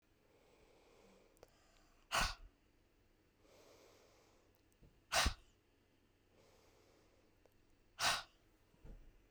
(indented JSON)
{
  "exhalation_length": "9.3 s",
  "exhalation_amplitude": 2971,
  "exhalation_signal_mean_std_ratio": 0.26,
  "survey_phase": "beta (2021-08-13 to 2022-03-07)",
  "age": "18-44",
  "gender": "Female",
  "wearing_mask": "No",
  "symptom_cough_any": true,
  "symptom_runny_or_blocked_nose": true,
  "symptom_sore_throat": true,
  "symptom_fatigue": true,
  "symptom_headache": true,
  "symptom_onset": "3 days",
  "smoker_status": "Never smoked",
  "respiratory_condition_asthma": false,
  "respiratory_condition_other": false,
  "recruitment_source": "Test and Trace",
  "submission_delay": "2 days",
  "covid_test_result": "Positive",
  "covid_test_method": "RT-qPCR"
}